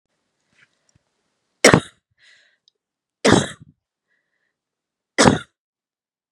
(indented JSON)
{
  "three_cough_length": "6.3 s",
  "three_cough_amplitude": 32768,
  "three_cough_signal_mean_std_ratio": 0.22,
  "survey_phase": "beta (2021-08-13 to 2022-03-07)",
  "age": "45-64",
  "gender": "Female",
  "wearing_mask": "No",
  "symptom_runny_or_blocked_nose": true,
  "symptom_fatigue": true,
  "symptom_headache": true,
  "smoker_status": "Never smoked",
  "respiratory_condition_asthma": false,
  "respiratory_condition_other": true,
  "recruitment_source": "REACT",
  "submission_delay": "1 day",
  "covid_test_result": "Negative",
  "covid_test_method": "RT-qPCR",
  "influenza_a_test_result": "Negative",
  "influenza_b_test_result": "Negative"
}